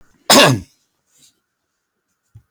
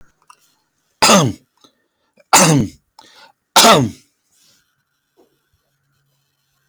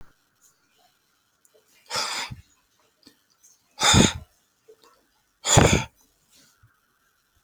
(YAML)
cough_length: 2.5 s
cough_amplitude: 32767
cough_signal_mean_std_ratio: 0.29
three_cough_length: 6.7 s
three_cough_amplitude: 32767
three_cough_signal_mean_std_ratio: 0.32
exhalation_length: 7.4 s
exhalation_amplitude: 26729
exhalation_signal_mean_std_ratio: 0.27
survey_phase: beta (2021-08-13 to 2022-03-07)
age: 65+
gender: Male
wearing_mask: 'No'
symptom_cough_any: true
smoker_status: Ex-smoker
respiratory_condition_asthma: false
respiratory_condition_other: false
recruitment_source: REACT
submission_delay: 2 days
covid_test_result: Negative
covid_test_method: RT-qPCR